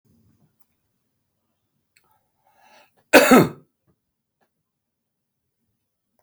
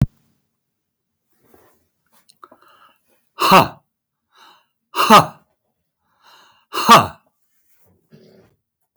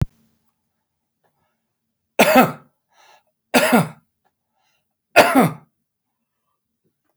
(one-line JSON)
{"cough_length": "6.2 s", "cough_amplitude": 30980, "cough_signal_mean_std_ratio": 0.18, "exhalation_length": "9.0 s", "exhalation_amplitude": 32768, "exhalation_signal_mean_std_ratio": 0.24, "three_cough_length": "7.2 s", "three_cough_amplitude": 31849, "three_cough_signal_mean_std_ratio": 0.28, "survey_phase": "beta (2021-08-13 to 2022-03-07)", "age": "65+", "gender": "Male", "wearing_mask": "No", "symptom_none": true, "smoker_status": "Current smoker (e-cigarettes or vapes only)", "respiratory_condition_asthma": false, "respiratory_condition_other": false, "recruitment_source": "REACT", "submission_delay": "3 days", "covid_test_result": "Negative", "covid_test_method": "RT-qPCR", "influenza_a_test_result": "Negative", "influenza_b_test_result": "Negative"}